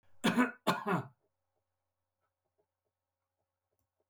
cough_length: 4.1 s
cough_amplitude: 5069
cough_signal_mean_std_ratio: 0.29
survey_phase: beta (2021-08-13 to 2022-03-07)
age: 65+
gender: Male
wearing_mask: 'No'
symptom_none: true
smoker_status: Never smoked
respiratory_condition_asthma: false
respiratory_condition_other: false
recruitment_source: REACT
submission_delay: 2 days
covid_test_result: Negative
covid_test_method: RT-qPCR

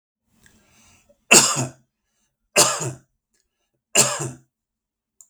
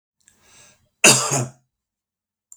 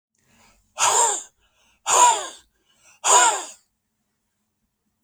three_cough_length: 5.3 s
three_cough_amplitude: 32768
three_cough_signal_mean_std_ratio: 0.3
cough_length: 2.6 s
cough_amplitude: 32768
cough_signal_mean_std_ratio: 0.28
exhalation_length: 5.0 s
exhalation_amplitude: 25009
exhalation_signal_mean_std_ratio: 0.38
survey_phase: beta (2021-08-13 to 2022-03-07)
age: 65+
gender: Male
wearing_mask: 'No'
symptom_none: true
symptom_onset: 4 days
smoker_status: Never smoked
respiratory_condition_asthma: false
respiratory_condition_other: false
recruitment_source: REACT
submission_delay: 3 days
covid_test_result: Negative
covid_test_method: RT-qPCR
influenza_a_test_result: Unknown/Void
influenza_b_test_result: Unknown/Void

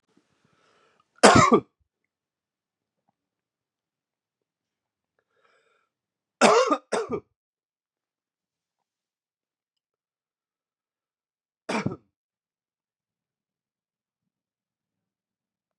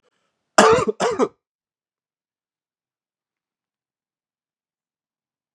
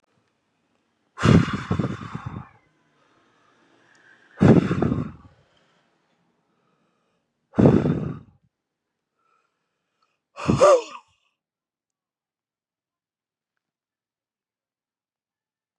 three_cough_length: 15.8 s
three_cough_amplitude: 32420
three_cough_signal_mean_std_ratio: 0.18
cough_length: 5.5 s
cough_amplitude: 32768
cough_signal_mean_std_ratio: 0.23
exhalation_length: 15.8 s
exhalation_amplitude: 27353
exhalation_signal_mean_std_ratio: 0.27
survey_phase: beta (2021-08-13 to 2022-03-07)
age: 18-44
gender: Male
wearing_mask: 'No'
symptom_runny_or_blocked_nose: true
symptom_fatigue: true
symptom_fever_high_temperature: true
symptom_headache: true
symptom_onset: 2 days
smoker_status: Current smoker (11 or more cigarettes per day)
respiratory_condition_asthma: false
respiratory_condition_other: false
recruitment_source: Test and Trace
submission_delay: 1 day
covid_test_result: Positive
covid_test_method: ePCR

